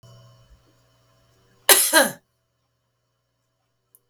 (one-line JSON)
{"cough_length": "4.1 s", "cough_amplitude": 32768, "cough_signal_mean_std_ratio": 0.23, "survey_phase": "beta (2021-08-13 to 2022-03-07)", "age": "65+", "gender": "Female", "wearing_mask": "No", "symptom_none": true, "smoker_status": "Ex-smoker", "respiratory_condition_asthma": false, "respiratory_condition_other": false, "recruitment_source": "REACT", "submission_delay": "2 days", "covid_test_result": "Negative", "covid_test_method": "RT-qPCR", "influenza_a_test_result": "Unknown/Void", "influenza_b_test_result": "Unknown/Void"}